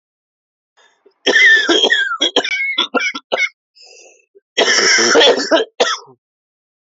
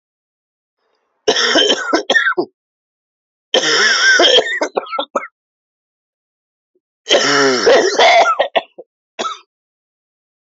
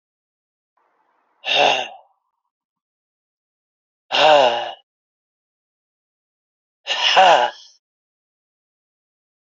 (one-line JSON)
{"cough_length": "7.0 s", "cough_amplitude": 32768, "cough_signal_mean_std_ratio": 0.56, "three_cough_length": "10.6 s", "three_cough_amplitude": 32467, "three_cough_signal_mean_std_ratio": 0.51, "exhalation_length": "9.5 s", "exhalation_amplitude": 28262, "exhalation_signal_mean_std_ratio": 0.3, "survey_phase": "alpha (2021-03-01 to 2021-08-12)", "age": "18-44", "gender": "Male", "wearing_mask": "No", "symptom_cough_any": true, "symptom_fatigue": true, "symptom_fever_high_temperature": true, "symptom_headache": true, "symptom_onset": "4 days", "smoker_status": "Never smoked", "respiratory_condition_asthma": true, "respiratory_condition_other": false, "recruitment_source": "Test and Trace", "submission_delay": "1 day", "covid_test_result": "Positive", "covid_test_method": "RT-qPCR"}